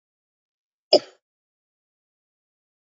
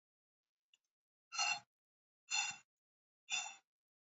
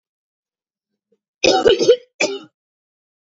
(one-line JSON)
{"cough_length": "2.8 s", "cough_amplitude": 27687, "cough_signal_mean_std_ratio": 0.11, "exhalation_length": "4.2 s", "exhalation_amplitude": 2015, "exhalation_signal_mean_std_ratio": 0.32, "three_cough_length": "3.3 s", "three_cough_amplitude": 27478, "three_cough_signal_mean_std_ratio": 0.33, "survey_phase": "beta (2021-08-13 to 2022-03-07)", "age": "18-44", "gender": "Female", "wearing_mask": "No", "symptom_cough_any": true, "smoker_status": "Ex-smoker", "respiratory_condition_asthma": false, "respiratory_condition_other": false, "recruitment_source": "REACT", "submission_delay": "2 days", "covid_test_result": "Negative", "covid_test_method": "RT-qPCR", "influenza_a_test_result": "Negative", "influenza_b_test_result": "Negative"}